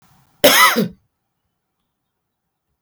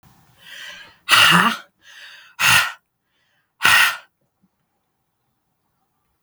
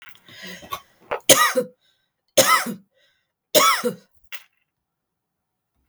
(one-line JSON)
{"cough_length": "2.8 s", "cough_amplitude": 32768, "cough_signal_mean_std_ratio": 0.31, "exhalation_length": "6.2 s", "exhalation_amplitude": 32768, "exhalation_signal_mean_std_ratio": 0.35, "three_cough_length": "5.9 s", "three_cough_amplitude": 32768, "three_cough_signal_mean_std_ratio": 0.33, "survey_phase": "beta (2021-08-13 to 2022-03-07)", "age": "65+", "gender": "Female", "wearing_mask": "No", "symptom_runny_or_blocked_nose": true, "symptom_onset": "12 days", "smoker_status": "Ex-smoker", "respiratory_condition_asthma": false, "respiratory_condition_other": false, "recruitment_source": "REACT", "submission_delay": "0 days", "covid_test_result": "Negative", "covid_test_method": "RT-qPCR", "influenza_a_test_result": "Negative", "influenza_b_test_result": "Negative"}